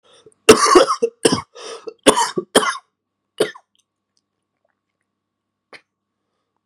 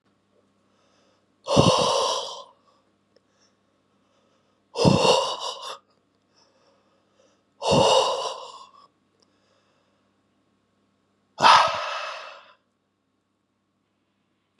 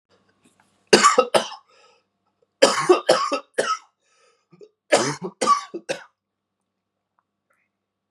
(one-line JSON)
{"cough_length": "6.7 s", "cough_amplitude": 32768, "cough_signal_mean_std_ratio": 0.3, "exhalation_length": "14.6 s", "exhalation_amplitude": 26537, "exhalation_signal_mean_std_ratio": 0.34, "three_cough_length": "8.1 s", "three_cough_amplitude": 32768, "three_cough_signal_mean_std_ratio": 0.34, "survey_phase": "beta (2021-08-13 to 2022-03-07)", "age": "18-44", "gender": "Male", "wearing_mask": "No", "symptom_cough_any": true, "symptom_runny_or_blocked_nose": true, "symptom_sore_throat": true, "symptom_fatigue": true, "symptom_headache": true, "symptom_other": true, "smoker_status": "Ex-smoker", "respiratory_condition_asthma": false, "respiratory_condition_other": false, "recruitment_source": "REACT", "submission_delay": "2 days", "covid_test_result": "Positive", "covid_test_method": "RT-qPCR", "covid_ct_value": 22.0, "covid_ct_gene": "E gene", "influenza_a_test_result": "Negative", "influenza_b_test_result": "Negative"}